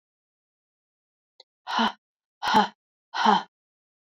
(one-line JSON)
{"exhalation_length": "4.0 s", "exhalation_amplitude": 18257, "exhalation_signal_mean_std_ratio": 0.32, "survey_phase": "beta (2021-08-13 to 2022-03-07)", "age": "45-64", "gender": "Female", "wearing_mask": "No", "symptom_cough_any": true, "symptom_runny_or_blocked_nose": true, "symptom_sore_throat": true, "symptom_fatigue": true, "symptom_fever_high_temperature": true, "symptom_headache": true, "smoker_status": "Prefer not to say", "respiratory_condition_asthma": false, "respiratory_condition_other": true, "recruitment_source": "Test and Trace", "submission_delay": "2 days", "covid_test_result": "Positive", "covid_test_method": "RT-qPCR", "covid_ct_value": 31.2, "covid_ct_gene": "ORF1ab gene"}